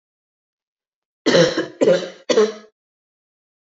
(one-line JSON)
{"three_cough_length": "3.8 s", "three_cough_amplitude": 29539, "three_cough_signal_mean_std_ratio": 0.37, "survey_phase": "beta (2021-08-13 to 2022-03-07)", "age": "18-44", "gender": "Female", "wearing_mask": "No", "symptom_cough_any": true, "symptom_new_continuous_cough": true, "symptom_runny_or_blocked_nose": true, "symptom_shortness_of_breath": true, "symptom_sore_throat": true, "symptom_abdominal_pain": true, "symptom_diarrhoea": true, "symptom_fatigue": true, "symptom_fever_high_temperature": true, "symptom_headache": true, "symptom_onset": "4 days", "smoker_status": "Never smoked", "respiratory_condition_asthma": false, "respiratory_condition_other": false, "recruitment_source": "Test and Trace", "submission_delay": "1 day", "covid_test_result": "Positive", "covid_test_method": "RT-qPCR", "covid_ct_value": 34.1, "covid_ct_gene": "ORF1ab gene", "covid_ct_mean": 34.8, "covid_viral_load": "3.7 copies/ml", "covid_viral_load_category": "Minimal viral load (< 10K copies/ml)"}